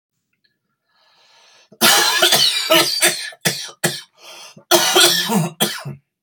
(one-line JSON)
{"cough_length": "6.2 s", "cough_amplitude": 32768, "cough_signal_mean_std_ratio": 0.54, "survey_phase": "beta (2021-08-13 to 2022-03-07)", "age": "45-64", "gender": "Male", "wearing_mask": "No", "symptom_cough_any": true, "symptom_new_continuous_cough": true, "symptom_change_to_sense_of_smell_or_taste": true, "symptom_loss_of_taste": true, "smoker_status": "Ex-smoker", "respiratory_condition_asthma": false, "respiratory_condition_other": false, "recruitment_source": "Test and Trace", "submission_delay": "-1 day", "covid_test_result": "Positive", "covid_test_method": "LFT"}